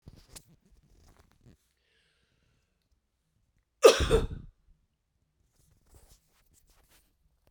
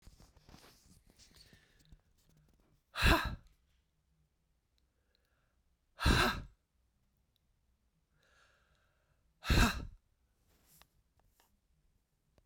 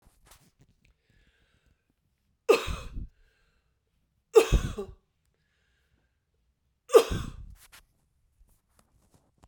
{"cough_length": "7.5 s", "cough_amplitude": 19181, "cough_signal_mean_std_ratio": 0.17, "exhalation_length": "12.5 s", "exhalation_amplitude": 6513, "exhalation_signal_mean_std_ratio": 0.24, "three_cough_length": "9.5 s", "three_cough_amplitude": 17341, "three_cough_signal_mean_std_ratio": 0.21, "survey_phase": "beta (2021-08-13 to 2022-03-07)", "age": "45-64", "gender": "Female", "wearing_mask": "No", "symptom_cough_any": true, "symptom_runny_or_blocked_nose": true, "symptom_fatigue": true, "symptom_change_to_sense_of_smell_or_taste": true, "symptom_loss_of_taste": true, "smoker_status": "Ex-smoker", "respiratory_condition_asthma": false, "respiratory_condition_other": false, "recruitment_source": "Test and Trace", "submission_delay": "1 day", "covid_test_result": "Positive", "covid_test_method": "RT-qPCR", "covid_ct_value": 17.6, "covid_ct_gene": "ORF1ab gene", "covid_ct_mean": 18.3, "covid_viral_load": "1000000 copies/ml", "covid_viral_load_category": "High viral load (>1M copies/ml)"}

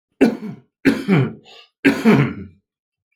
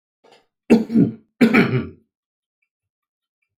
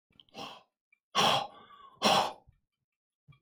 {"three_cough_length": "3.2 s", "three_cough_amplitude": 28209, "three_cough_signal_mean_std_ratio": 0.47, "cough_length": "3.6 s", "cough_amplitude": 27816, "cough_signal_mean_std_ratio": 0.36, "exhalation_length": "3.4 s", "exhalation_amplitude": 7819, "exhalation_signal_mean_std_ratio": 0.36, "survey_phase": "alpha (2021-03-01 to 2021-08-12)", "age": "45-64", "gender": "Male", "wearing_mask": "No", "symptom_shortness_of_breath": true, "symptom_fatigue": true, "symptom_headache": true, "symptom_onset": "13 days", "smoker_status": "Ex-smoker", "respiratory_condition_asthma": true, "respiratory_condition_other": false, "recruitment_source": "REACT", "submission_delay": "2 days", "covid_test_result": "Negative", "covid_test_method": "RT-qPCR"}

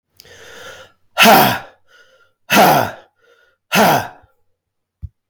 {"exhalation_length": "5.3 s", "exhalation_amplitude": 32768, "exhalation_signal_mean_std_ratio": 0.41, "survey_phase": "beta (2021-08-13 to 2022-03-07)", "age": "45-64", "gender": "Male", "wearing_mask": "No", "symptom_cough_any": true, "symptom_runny_or_blocked_nose": true, "symptom_sore_throat": true, "smoker_status": "Ex-smoker", "respiratory_condition_asthma": false, "respiratory_condition_other": false, "recruitment_source": "REACT", "submission_delay": "4 days", "covid_test_result": "Negative", "covid_test_method": "RT-qPCR", "influenza_a_test_result": "Negative", "influenza_b_test_result": "Negative"}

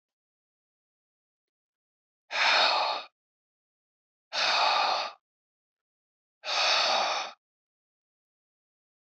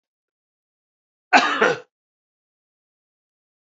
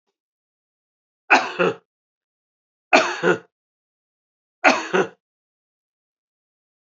{"exhalation_length": "9.0 s", "exhalation_amplitude": 9803, "exhalation_signal_mean_std_ratio": 0.41, "cough_length": "3.8 s", "cough_amplitude": 27927, "cough_signal_mean_std_ratio": 0.24, "three_cough_length": "6.8 s", "three_cough_amplitude": 28232, "three_cough_signal_mean_std_ratio": 0.28, "survey_phase": "beta (2021-08-13 to 2022-03-07)", "age": "45-64", "gender": "Male", "wearing_mask": "No", "symptom_cough_any": true, "symptom_runny_or_blocked_nose": true, "symptom_sore_throat": true, "symptom_fatigue": true, "symptom_headache": true, "smoker_status": "Never smoked", "respiratory_condition_asthma": false, "respiratory_condition_other": false, "recruitment_source": "Test and Trace", "submission_delay": "2 days", "covid_test_result": "Positive", "covid_test_method": "LFT"}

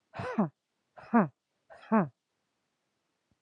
{"exhalation_length": "3.4 s", "exhalation_amplitude": 7316, "exhalation_signal_mean_std_ratio": 0.32, "survey_phase": "beta (2021-08-13 to 2022-03-07)", "age": "18-44", "gender": "Female", "wearing_mask": "No", "symptom_cough_any": true, "symptom_runny_or_blocked_nose": true, "symptom_shortness_of_breath": true, "symptom_sore_throat": true, "symptom_diarrhoea": true, "symptom_fatigue": true, "symptom_fever_high_temperature": true, "symptom_headache": true, "symptom_other": true, "symptom_onset": "6 days", "smoker_status": "Ex-smoker", "respiratory_condition_asthma": true, "respiratory_condition_other": false, "recruitment_source": "Test and Trace", "submission_delay": "2 days", "covid_test_result": "Positive", "covid_test_method": "RT-qPCR", "covid_ct_value": 17.9, "covid_ct_gene": "ORF1ab gene", "covid_ct_mean": 18.3, "covid_viral_load": "970000 copies/ml", "covid_viral_load_category": "Low viral load (10K-1M copies/ml)"}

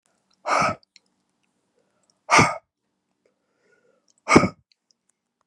{"exhalation_length": "5.5 s", "exhalation_amplitude": 32767, "exhalation_signal_mean_std_ratio": 0.26, "survey_phase": "beta (2021-08-13 to 2022-03-07)", "age": "45-64", "wearing_mask": "No", "symptom_cough_any": true, "symptom_runny_or_blocked_nose": true, "symptom_sore_throat": true, "symptom_fatigue": true, "symptom_headache": true, "symptom_onset": "3 days", "smoker_status": "Never smoked", "respiratory_condition_asthma": false, "respiratory_condition_other": false, "recruitment_source": "Test and Trace", "submission_delay": "3 days", "covid_test_result": "Positive", "covid_test_method": "RT-qPCR", "covid_ct_value": 28.1, "covid_ct_gene": "N gene"}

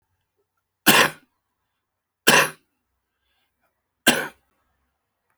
{"three_cough_length": "5.4 s", "three_cough_amplitude": 32768, "three_cough_signal_mean_std_ratio": 0.25, "survey_phase": "beta (2021-08-13 to 2022-03-07)", "age": "65+", "gender": "Male", "wearing_mask": "No", "symptom_cough_any": true, "smoker_status": "Current smoker (11 or more cigarettes per day)", "respiratory_condition_asthma": false, "respiratory_condition_other": false, "recruitment_source": "REACT", "submission_delay": "1 day", "covid_test_result": "Negative", "covid_test_method": "RT-qPCR"}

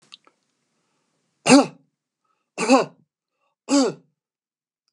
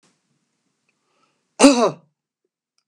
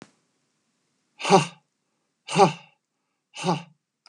{"three_cough_length": "4.9 s", "three_cough_amplitude": 30682, "three_cough_signal_mean_std_ratio": 0.27, "cough_length": "2.9 s", "cough_amplitude": 32768, "cough_signal_mean_std_ratio": 0.24, "exhalation_length": "4.1 s", "exhalation_amplitude": 28112, "exhalation_signal_mean_std_ratio": 0.27, "survey_phase": "beta (2021-08-13 to 2022-03-07)", "age": "45-64", "gender": "Male", "wearing_mask": "No", "symptom_runny_or_blocked_nose": true, "symptom_fatigue": true, "symptom_onset": "12 days", "smoker_status": "Never smoked", "respiratory_condition_asthma": false, "respiratory_condition_other": false, "recruitment_source": "REACT", "submission_delay": "2 days", "covid_test_result": "Negative", "covid_test_method": "RT-qPCR", "influenza_a_test_result": "Negative", "influenza_b_test_result": "Negative"}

